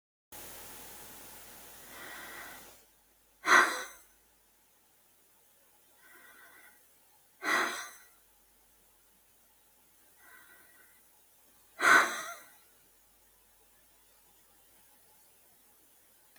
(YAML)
exhalation_length: 16.4 s
exhalation_amplitude: 12732
exhalation_signal_mean_std_ratio: 0.25
survey_phase: beta (2021-08-13 to 2022-03-07)
age: 65+
gender: Female
wearing_mask: 'No'
symptom_none: true
smoker_status: Never smoked
respiratory_condition_asthma: false
respiratory_condition_other: false
recruitment_source: REACT
submission_delay: 1 day
covid_test_result: Negative
covid_test_method: RT-qPCR
influenza_a_test_result: Negative
influenza_b_test_result: Negative